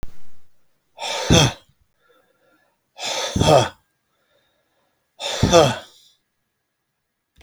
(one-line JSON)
{"exhalation_length": "7.4 s", "exhalation_amplitude": 32085, "exhalation_signal_mean_std_ratio": 0.37, "survey_phase": "beta (2021-08-13 to 2022-03-07)", "age": "45-64", "gender": "Male", "wearing_mask": "No", "symptom_fatigue": true, "smoker_status": "Never smoked", "respiratory_condition_asthma": false, "respiratory_condition_other": false, "recruitment_source": "REACT", "submission_delay": "1 day", "covid_test_result": "Negative", "covid_test_method": "RT-qPCR"}